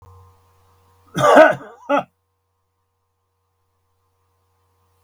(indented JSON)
{
  "cough_length": "5.0 s",
  "cough_amplitude": 32768,
  "cough_signal_mean_std_ratio": 0.24,
  "survey_phase": "beta (2021-08-13 to 2022-03-07)",
  "age": "65+",
  "gender": "Male",
  "wearing_mask": "No",
  "symptom_none": true,
  "smoker_status": "Never smoked",
  "respiratory_condition_asthma": false,
  "respiratory_condition_other": false,
  "recruitment_source": "REACT",
  "submission_delay": "0 days",
  "covid_test_result": "Negative",
  "covid_test_method": "RT-qPCR",
  "influenza_a_test_result": "Negative",
  "influenza_b_test_result": "Negative"
}